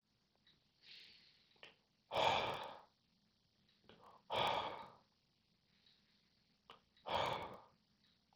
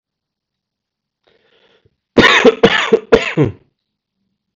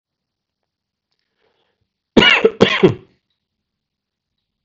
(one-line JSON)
{"exhalation_length": "8.4 s", "exhalation_amplitude": 2896, "exhalation_signal_mean_std_ratio": 0.35, "three_cough_length": "4.6 s", "three_cough_amplitude": 32768, "three_cough_signal_mean_std_ratio": 0.35, "cough_length": "4.6 s", "cough_amplitude": 32768, "cough_signal_mean_std_ratio": 0.26, "survey_phase": "beta (2021-08-13 to 2022-03-07)", "age": "18-44", "gender": "Male", "wearing_mask": "No", "symptom_cough_any": true, "symptom_new_continuous_cough": true, "symptom_runny_or_blocked_nose": true, "symptom_sore_throat": true, "symptom_change_to_sense_of_smell_or_taste": true, "smoker_status": "Never smoked", "respiratory_condition_asthma": false, "respiratory_condition_other": false, "recruitment_source": "Test and Trace", "submission_delay": "1 day", "covid_test_result": "Positive", "covid_test_method": "RT-qPCR"}